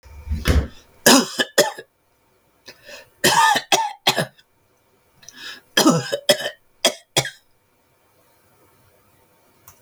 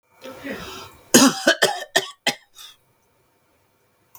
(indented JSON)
{
  "three_cough_length": "9.8 s",
  "three_cough_amplitude": 32768,
  "three_cough_signal_mean_std_ratio": 0.37,
  "cough_length": "4.2 s",
  "cough_amplitude": 32768,
  "cough_signal_mean_std_ratio": 0.32,
  "survey_phase": "beta (2021-08-13 to 2022-03-07)",
  "age": "45-64",
  "gender": "Male",
  "wearing_mask": "No",
  "symptom_none": true,
  "smoker_status": "Ex-smoker",
  "respiratory_condition_asthma": false,
  "respiratory_condition_other": false,
  "recruitment_source": "REACT",
  "submission_delay": "3 days",
  "covid_test_result": "Negative",
  "covid_test_method": "RT-qPCR",
  "influenza_a_test_result": "Negative",
  "influenza_b_test_result": "Negative"
}